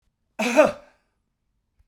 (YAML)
cough_length: 1.9 s
cough_amplitude: 23057
cough_signal_mean_std_ratio: 0.3
survey_phase: beta (2021-08-13 to 2022-03-07)
age: 65+
gender: Male
wearing_mask: 'No'
symptom_runny_or_blocked_nose: true
smoker_status: Never smoked
respiratory_condition_asthma: false
respiratory_condition_other: false
recruitment_source: Test and Trace
submission_delay: 2 days
covid_test_result: Positive
covid_test_method: RT-qPCR